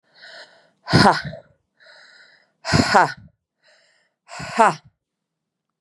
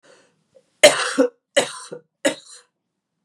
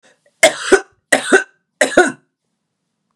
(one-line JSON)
{"exhalation_length": "5.8 s", "exhalation_amplitude": 32767, "exhalation_signal_mean_std_ratio": 0.31, "three_cough_length": "3.2 s", "three_cough_amplitude": 32768, "three_cough_signal_mean_std_ratio": 0.3, "cough_length": "3.2 s", "cough_amplitude": 32768, "cough_signal_mean_std_ratio": 0.35, "survey_phase": "beta (2021-08-13 to 2022-03-07)", "age": "45-64", "gender": "Female", "wearing_mask": "No", "symptom_cough_any": true, "symptom_sore_throat": true, "symptom_onset": "3 days", "smoker_status": "Ex-smoker", "respiratory_condition_asthma": false, "respiratory_condition_other": false, "recruitment_source": "Test and Trace", "submission_delay": "1 day", "covid_test_result": "Positive", "covid_test_method": "RT-qPCR", "covid_ct_value": 18.4, "covid_ct_gene": "N gene", "covid_ct_mean": 18.6, "covid_viral_load": "780000 copies/ml", "covid_viral_load_category": "Low viral load (10K-1M copies/ml)"}